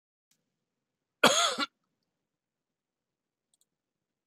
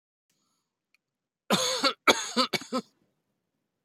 {"cough_length": "4.3 s", "cough_amplitude": 17076, "cough_signal_mean_std_ratio": 0.21, "three_cough_length": "3.8 s", "three_cough_amplitude": 19483, "three_cough_signal_mean_std_ratio": 0.34, "survey_phase": "beta (2021-08-13 to 2022-03-07)", "age": "65+", "gender": "Male", "wearing_mask": "No", "symptom_none": true, "smoker_status": "Never smoked", "respiratory_condition_asthma": false, "respiratory_condition_other": false, "recruitment_source": "REACT", "submission_delay": "1 day", "covid_test_result": "Negative", "covid_test_method": "RT-qPCR"}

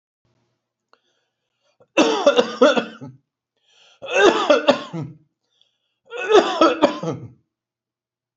{"three_cough_length": "8.4 s", "three_cough_amplitude": 29195, "three_cough_signal_mean_std_ratio": 0.39, "survey_phase": "beta (2021-08-13 to 2022-03-07)", "age": "65+", "gender": "Male", "wearing_mask": "No", "symptom_none": true, "smoker_status": "Never smoked", "respiratory_condition_asthma": false, "respiratory_condition_other": false, "recruitment_source": "REACT", "submission_delay": "1 day", "covid_test_result": "Negative", "covid_test_method": "RT-qPCR", "influenza_a_test_result": "Negative", "influenza_b_test_result": "Negative"}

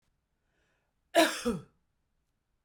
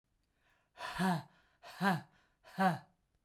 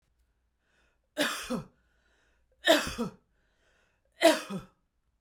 {"cough_length": "2.6 s", "cough_amplitude": 10839, "cough_signal_mean_std_ratio": 0.26, "exhalation_length": "3.2 s", "exhalation_amplitude": 3775, "exhalation_signal_mean_std_ratio": 0.41, "three_cough_length": "5.2 s", "three_cough_amplitude": 13966, "three_cough_signal_mean_std_ratio": 0.3, "survey_phase": "beta (2021-08-13 to 2022-03-07)", "age": "45-64", "gender": "Female", "wearing_mask": "No", "symptom_none": true, "smoker_status": "Ex-smoker", "respiratory_condition_asthma": false, "respiratory_condition_other": false, "recruitment_source": "REACT", "submission_delay": "1 day", "covid_test_result": "Negative", "covid_test_method": "RT-qPCR", "influenza_a_test_result": "Negative", "influenza_b_test_result": "Negative"}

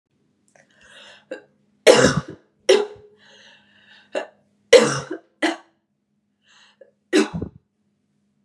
{"three_cough_length": "8.4 s", "three_cough_amplitude": 32768, "three_cough_signal_mean_std_ratio": 0.28, "survey_phase": "beta (2021-08-13 to 2022-03-07)", "age": "18-44", "gender": "Female", "wearing_mask": "No", "symptom_cough_any": true, "symptom_sore_throat": true, "symptom_fatigue": true, "symptom_fever_high_temperature": true, "symptom_headache": true, "smoker_status": "Never smoked", "respiratory_condition_asthma": false, "respiratory_condition_other": false, "recruitment_source": "Test and Trace", "submission_delay": "0 days", "covid_test_result": "Positive", "covid_test_method": "LFT"}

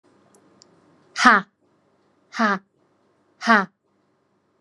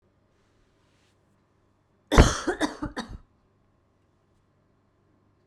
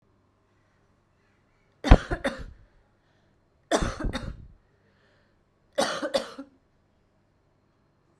{"exhalation_length": "4.6 s", "exhalation_amplitude": 32767, "exhalation_signal_mean_std_ratio": 0.26, "cough_length": "5.5 s", "cough_amplitude": 30393, "cough_signal_mean_std_ratio": 0.21, "three_cough_length": "8.2 s", "three_cough_amplitude": 32767, "three_cough_signal_mean_std_ratio": 0.23, "survey_phase": "beta (2021-08-13 to 2022-03-07)", "age": "18-44", "gender": "Female", "wearing_mask": "No", "symptom_cough_any": true, "symptom_runny_or_blocked_nose": true, "symptom_shortness_of_breath": true, "symptom_fatigue": true, "symptom_fever_high_temperature": true, "symptom_other": true, "symptom_onset": "2 days", "smoker_status": "Ex-smoker", "respiratory_condition_asthma": false, "respiratory_condition_other": false, "recruitment_source": "Test and Trace", "submission_delay": "1 day", "covid_test_result": "Positive", "covid_test_method": "LAMP"}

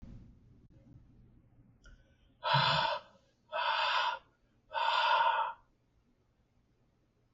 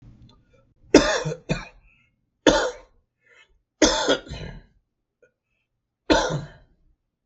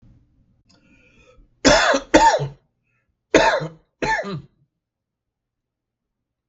{"exhalation_length": "7.3 s", "exhalation_amplitude": 4951, "exhalation_signal_mean_std_ratio": 0.47, "three_cough_length": "7.3 s", "three_cough_amplitude": 32768, "three_cough_signal_mean_std_ratio": 0.33, "cough_length": "6.5 s", "cough_amplitude": 32768, "cough_signal_mean_std_ratio": 0.35, "survey_phase": "beta (2021-08-13 to 2022-03-07)", "age": "65+", "gender": "Male", "wearing_mask": "No", "symptom_none": true, "smoker_status": "Never smoked", "respiratory_condition_asthma": false, "respiratory_condition_other": false, "recruitment_source": "REACT", "submission_delay": "3 days", "covid_test_result": "Negative", "covid_test_method": "RT-qPCR", "influenza_a_test_result": "Negative", "influenza_b_test_result": "Negative"}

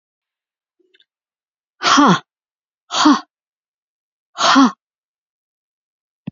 {"exhalation_length": "6.3 s", "exhalation_amplitude": 28529, "exhalation_signal_mean_std_ratio": 0.31, "survey_phase": "beta (2021-08-13 to 2022-03-07)", "age": "65+", "gender": "Female", "wearing_mask": "No", "symptom_none": true, "smoker_status": "Ex-smoker", "respiratory_condition_asthma": false, "respiratory_condition_other": false, "recruitment_source": "REACT", "submission_delay": "1 day", "covid_test_result": "Negative", "covid_test_method": "RT-qPCR"}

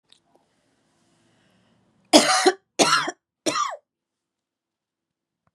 {"three_cough_length": "5.5 s", "three_cough_amplitude": 32767, "three_cough_signal_mean_std_ratio": 0.29, "survey_phase": "beta (2021-08-13 to 2022-03-07)", "age": "18-44", "gender": "Female", "wearing_mask": "No", "symptom_headache": true, "smoker_status": "Current smoker (e-cigarettes or vapes only)", "respiratory_condition_asthma": false, "respiratory_condition_other": false, "recruitment_source": "Test and Trace", "submission_delay": "0 days", "covid_test_result": "Negative", "covid_test_method": "LFT"}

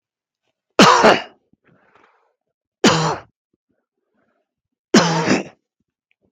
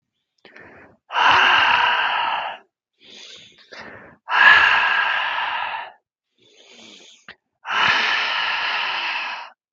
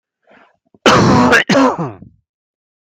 {"three_cough_length": "6.3 s", "three_cough_amplitude": 32631, "three_cough_signal_mean_std_ratio": 0.33, "exhalation_length": "9.7 s", "exhalation_amplitude": 32629, "exhalation_signal_mean_std_ratio": 0.57, "cough_length": "2.8 s", "cough_amplitude": 32631, "cough_signal_mean_std_ratio": 0.52, "survey_phase": "beta (2021-08-13 to 2022-03-07)", "age": "18-44", "gender": "Male", "wearing_mask": "Yes", "symptom_cough_any": true, "symptom_runny_or_blocked_nose": true, "symptom_sore_throat": true, "smoker_status": "Ex-smoker", "respiratory_condition_asthma": false, "respiratory_condition_other": false, "recruitment_source": "Test and Trace", "submission_delay": "2 days", "covid_test_result": "Positive", "covid_test_method": "LFT"}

